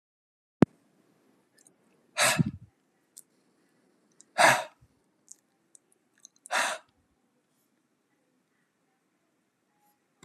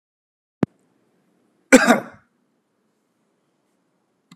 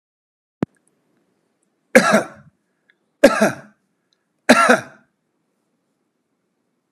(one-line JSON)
{"exhalation_length": "10.2 s", "exhalation_amplitude": 22518, "exhalation_signal_mean_std_ratio": 0.2, "cough_length": "4.4 s", "cough_amplitude": 32768, "cough_signal_mean_std_ratio": 0.18, "three_cough_length": "6.9 s", "three_cough_amplitude": 32768, "three_cough_signal_mean_std_ratio": 0.26, "survey_phase": "beta (2021-08-13 to 2022-03-07)", "age": "65+", "gender": "Male", "wearing_mask": "No", "symptom_none": true, "smoker_status": "Ex-smoker", "respiratory_condition_asthma": false, "respiratory_condition_other": false, "recruitment_source": "REACT", "submission_delay": "1 day", "covid_test_result": "Negative", "covid_test_method": "RT-qPCR"}